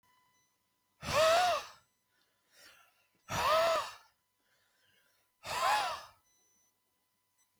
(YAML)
exhalation_length: 7.6 s
exhalation_amplitude: 5044
exhalation_signal_mean_std_ratio: 0.39
survey_phase: beta (2021-08-13 to 2022-03-07)
age: 45-64
gender: Male
wearing_mask: 'No'
symptom_cough_any: true
symptom_new_continuous_cough: true
symptom_onset: 7 days
smoker_status: Ex-smoker
respiratory_condition_asthma: true
respiratory_condition_other: false
recruitment_source: REACT
submission_delay: 1 day
covid_test_result: Negative
covid_test_method: RT-qPCR